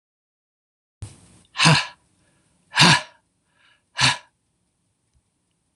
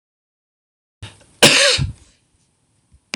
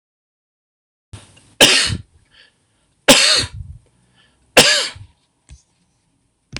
{"exhalation_length": "5.8 s", "exhalation_amplitude": 26027, "exhalation_signal_mean_std_ratio": 0.27, "cough_length": "3.2 s", "cough_amplitude": 26028, "cough_signal_mean_std_ratio": 0.3, "three_cough_length": "6.6 s", "three_cough_amplitude": 26028, "three_cough_signal_mean_std_ratio": 0.32, "survey_phase": "beta (2021-08-13 to 2022-03-07)", "age": "65+", "gender": "Male", "wearing_mask": "No", "symptom_runny_or_blocked_nose": true, "smoker_status": "Never smoked", "respiratory_condition_asthma": false, "respiratory_condition_other": false, "recruitment_source": "REACT", "submission_delay": "1 day", "covid_test_result": "Negative", "covid_test_method": "RT-qPCR", "influenza_a_test_result": "Negative", "influenza_b_test_result": "Negative"}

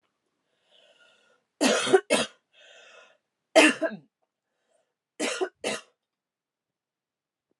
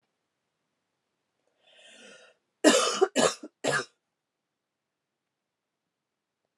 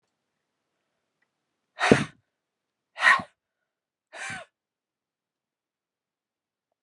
{"three_cough_length": "7.6 s", "three_cough_amplitude": 20437, "three_cough_signal_mean_std_ratio": 0.28, "cough_length": "6.6 s", "cough_amplitude": 21122, "cough_signal_mean_std_ratio": 0.25, "exhalation_length": "6.8 s", "exhalation_amplitude": 29889, "exhalation_signal_mean_std_ratio": 0.19, "survey_phase": "beta (2021-08-13 to 2022-03-07)", "age": "45-64", "gender": "Female", "wearing_mask": "No", "symptom_new_continuous_cough": true, "symptom_runny_or_blocked_nose": true, "symptom_shortness_of_breath": true, "symptom_sore_throat": true, "symptom_fatigue": true, "symptom_fever_high_temperature": true, "symptom_headache": true, "symptom_onset": "3 days", "smoker_status": "Never smoked", "respiratory_condition_asthma": false, "respiratory_condition_other": false, "recruitment_source": "Test and Trace", "submission_delay": "2 days", "covid_test_result": "Positive", "covid_test_method": "RT-qPCR", "covid_ct_value": 20.0, "covid_ct_gene": "N gene"}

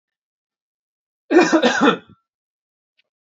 {"cough_length": "3.2 s", "cough_amplitude": 27105, "cough_signal_mean_std_ratio": 0.34, "survey_phase": "alpha (2021-03-01 to 2021-08-12)", "age": "18-44", "gender": "Male", "wearing_mask": "No", "symptom_none": true, "smoker_status": "Never smoked", "respiratory_condition_asthma": false, "respiratory_condition_other": false, "recruitment_source": "REACT", "submission_delay": "1 day", "covid_test_result": "Negative", "covid_test_method": "RT-qPCR"}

